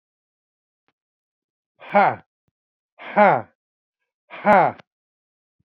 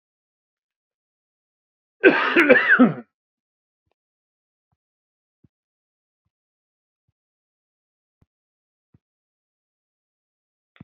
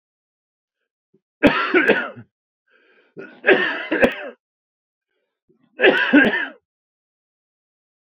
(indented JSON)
{
  "exhalation_length": "5.7 s",
  "exhalation_amplitude": 27929,
  "exhalation_signal_mean_std_ratio": 0.26,
  "cough_length": "10.8 s",
  "cough_amplitude": 27986,
  "cough_signal_mean_std_ratio": 0.21,
  "three_cough_length": "8.0 s",
  "three_cough_amplitude": 28305,
  "three_cough_signal_mean_std_ratio": 0.36,
  "survey_phase": "beta (2021-08-13 to 2022-03-07)",
  "age": "45-64",
  "gender": "Male",
  "wearing_mask": "No",
  "symptom_cough_any": true,
  "symptom_runny_or_blocked_nose": true,
  "symptom_sore_throat": true,
  "symptom_fatigue": true,
  "smoker_status": "Never smoked",
  "respiratory_condition_asthma": false,
  "respiratory_condition_other": false,
  "recruitment_source": "Test and Trace",
  "submission_delay": "1 day",
  "covid_test_result": "Positive",
  "covid_test_method": "LFT"
}